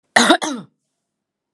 {"cough_length": "1.5 s", "cough_amplitude": 32768, "cough_signal_mean_std_ratio": 0.35, "survey_phase": "alpha (2021-03-01 to 2021-08-12)", "age": "45-64", "gender": "Female", "wearing_mask": "No", "symptom_none": true, "smoker_status": "Never smoked", "respiratory_condition_asthma": false, "respiratory_condition_other": false, "recruitment_source": "REACT", "submission_delay": "1 day", "covid_test_result": "Negative", "covid_test_method": "RT-qPCR"}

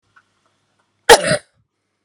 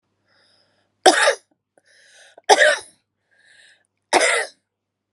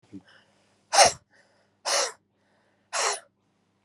{"cough_length": "2.0 s", "cough_amplitude": 32768, "cough_signal_mean_std_ratio": 0.24, "three_cough_length": "5.1 s", "three_cough_amplitude": 32768, "three_cough_signal_mean_std_ratio": 0.32, "exhalation_length": "3.8 s", "exhalation_amplitude": 21252, "exhalation_signal_mean_std_ratio": 0.3, "survey_phase": "beta (2021-08-13 to 2022-03-07)", "age": "45-64", "gender": "Female", "wearing_mask": "No", "symptom_cough_any": true, "symptom_shortness_of_breath": true, "symptom_sore_throat": true, "symptom_fatigue": true, "symptom_change_to_sense_of_smell_or_taste": true, "smoker_status": "Never smoked", "respiratory_condition_asthma": true, "respiratory_condition_other": false, "recruitment_source": "Test and Trace", "submission_delay": "2 days", "covid_test_result": "Positive", "covid_test_method": "RT-qPCR"}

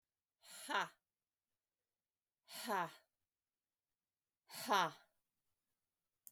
{"exhalation_length": "6.3 s", "exhalation_amplitude": 2627, "exhalation_signal_mean_std_ratio": 0.27, "survey_phase": "beta (2021-08-13 to 2022-03-07)", "age": "65+", "gender": "Female", "wearing_mask": "No", "symptom_none": true, "smoker_status": "Ex-smoker", "respiratory_condition_asthma": true, "respiratory_condition_other": false, "recruitment_source": "REACT", "submission_delay": "2 days", "covid_test_result": "Negative", "covid_test_method": "RT-qPCR", "influenza_a_test_result": "Negative", "influenza_b_test_result": "Negative"}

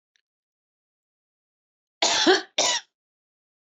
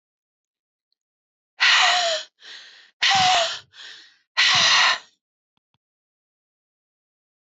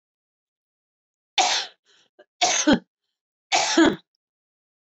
{"cough_length": "3.7 s", "cough_amplitude": 16789, "cough_signal_mean_std_ratio": 0.31, "exhalation_length": "7.6 s", "exhalation_amplitude": 17237, "exhalation_signal_mean_std_ratio": 0.41, "three_cough_length": "4.9 s", "three_cough_amplitude": 16689, "three_cough_signal_mean_std_ratio": 0.36, "survey_phase": "alpha (2021-03-01 to 2021-08-12)", "age": "65+", "gender": "Female", "wearing_mask": "No", "symptom_fatigue": true, "smoker_status": "Ex-smoker", "respiratory_condition_asthma": true, "respiratory_condition_other": false, "recruitment_source": "REACT", "submission_delay": "1 day", "covid_test_result": "Negative", "covid_test_method": "RT-qPCR"}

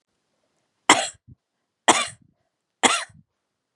{"three_cough_length": "3.8 s", "three_cough_amplitude": 32767, "three_cough_signal_mean_std_ratio": 0.26, "survey_phase": "beta (2021-08-13 to 2022-03-07)", "age": "45-64", "gender": "Female", "wearing_mask": "No", "symptom_cough_any": true, "symptom_fatigue": true, "symptom_headache": true, "symptom_onset": "4 days", "smoker_status": "Never smoked", "respiratory_condition_asthma": false, "respiratory_condition_other": false, "recruitment_source": "Test and Trace", "submission_delay": "2 days", "covid_test_result": "Positive", "covid_test_method": "RT-qPCR", "covid_ct_value": 24.9, "covid_ct_gene": "ORF1ab gene"}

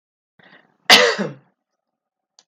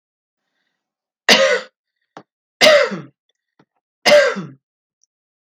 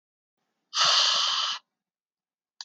{"cough_length": "2.5 s", "cough_amplitude": 32768, "cough_signal_mean_std_ratio": 0.27, "three_cough_length": "5.5 s", "three_cough_amplitude": 32768, "three_cough_signal_mean_std_ratio": 0.34, "exhalation_length": "2.6 s", "exhalation_amplitude": 13159, "exhalation_signal_mean_std_ratio": 0.47, "survey_phase": "beta (2021-08-13 to 2022-03-07)", "age": "18-44", "gender": "Female", "wearing_mask": "No", "symptom_none": true, "smoker_status": "Ex-smoker", "respiratory_condition_asthma": false, "respiratory_condition_other": false, "recruitment_source": "REACT", "submission_delay": "14 days", "covid_test_result": "Negative", "covid_test_method": "RT-qPCR"}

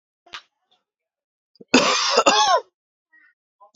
{"cough_length": "3.8 s", "cough_amplitude": 27993, "cough_signal_mean_std_ratio": 0.38, "survey_phase": "beta (2021-08-13 to 2022-03-07)", "age": "18-44", "gender": "Male", "wearing_mask": "No", "symptom_none": true, "smoker_status": "Current smoker (1 to 10 cigarettes per day)", "respiratory_condition_asthma": false, "respiratory_condition_other": false, "recruitment_source": "REACT", "submission_delay": "2 days", "covid_test_result": "Negative", "covid_test_method": "RT-qPCR", "influenza_a_test_result": "Negative", "influenza_b_test_result": "Negative"}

